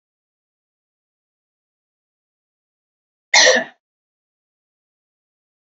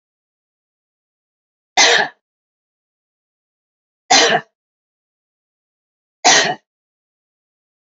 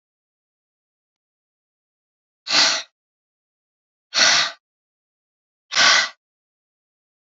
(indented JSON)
{
  "cough_length": "5.7 s",
  "cough_amplitude": 31884,
  "cough_signal_mean_std_ratio": 0.18,
  "three_cough_length": "7.9 s",
  "three_cough_amplitude": 32768,
  "three_cough_signal_mean_std_ratio": 0.26,
  "exhalation_length": "7.3 s",
  "exhalation_amplitude": 25652,
  "exhalation_signal_mean_std_ratio": 0.29,
  "survey_phase": "beta (2021-08-13 to 2022-03-07)",
  "age": "45-64",
  "gender": "Female",
  "wearing_mask": "No",
  "symptom_none": true,
  "smoker_status": "Ex-smoker",
  "respiratory_condition_asthma": false,
  "respiratory_condition_other": false,
  "recruitment_source": "REACT",
  "submission_delay": "4 days",
  "covid_test_result": "Negative",
  "covid_test_method": "RT-qPCR"
}